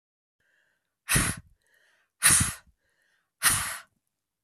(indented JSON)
{
  "exhalation_length": "4.4 s",
  "exhalation_amplitude": 22694,
  "exhalation_signal_mean_std_ratio": 0.33,
  "survey_phase": "beta (2021-08-13 to 2022-03-07)",
  "age": "45-64",
  "gender": "Female",
  "wearing_mask": "No",
  "symptom_cough_any": true,
  "symptom_runny_or_blocked_nose": true,
  "symptom_sore_throat": true,
  "symptom_fatigue": true,
  "symptom_fever_high_temperature": true,
  "symptom_headache": true,
  "symptom_change_to_sense_of_smell_or_taste": true,
  "smoker_status": "Never smoked",
  "respiratory_condition_asthma": false,
  "respiratory_condition_other": false,
  "recruitment_source": "Test and Trace",
  "submission_delay": "2 days",
  "covid_test_result": "Positive",
  "covid_test_method": "RT-qPCR",
  "covid_ct_value": 27.8,
  "covid_ct_gene": "ORF1ab gene"
}